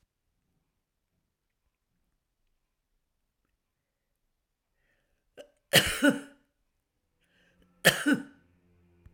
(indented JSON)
{
  "cough_length": "9.1 s",
  "cough_amplitude": 19966,
  "cough_signal_mean_std_ratio": 0.2,
  "survey_phase": "alpha (2021-03-01 to 2021-08-12)",
  "age": "65+",
  "gender": "Female",
  "wearing_mask": "No",
  "symptom_none": true,
  "smoker_status": "Ex-smoker",
  "respiratory_condition_asthma": false,
  "respiratory_condition_other": true,
  "recruitment_source": "REACT",
  "submission_delay": "1 day",
  "covid_test_result": "Negative",
  "covid_test_method": "RT-qPCR"
}